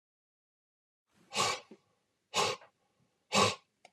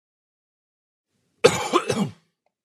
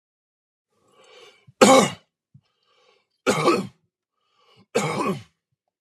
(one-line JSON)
{"exhalation_length": "3.9 s", "exhalation_amplitude": 7642, "exhalation_signal_mean_std_ratio": 0.32, "cough_length": "2.6 s", "cough_amplitude": 29877, "cough_signal_mean_std_ratio": 0.3, "three_cough_length": "5.8 s", "three_cough_amplitude": 32193, "three_cough_signal_mean_std_ratio": 0.31, "survey_phase": "beta (2021-08-13 to 2022-03-07)", "age": "45-64", "gender": "Male", "wearing_mask": "No", "symptom_none": true, "smoker_status": "Ex-smoker", "respiratory_condition_asthma": false, "respiratory_condition_other": false, "recruitment_source": "REACT", "submission_delay": "4 days", "covid_test_result": "Negative", "covid_test_method": "RT-qPCR"}